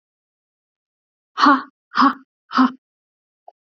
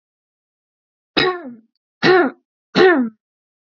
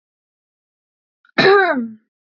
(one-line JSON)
{"exhalation_length": "3.8 s", "exhalation_amplitude": 29486, "exhalation_signal_mean_std_ratio": 0.3, "three_cough_length": "3.8 s", "three_cough_amplitude": 32767, "three_cough_signal_mean_std_ratio": 0.38, "cough_length": "2.3 s", "cough_amplitude": 27917, "cough_signal_mean_std_ratio": 0.36, "survey_phase": "beta (2021-08-13 to 2022-03-07)", "age": "18-44", "gender": "Female", "wearing_mask": "No", "symptom_none": true, "smoker_status": "Never smoked", "respiratory_condition_asthma": false, "respiratory_condition_other": false, "recruitment_source": "Test and Trace", "submission_delay": "1 day", "covid_test_result": "Negative", "covid_test_method": "RT-qPCR"}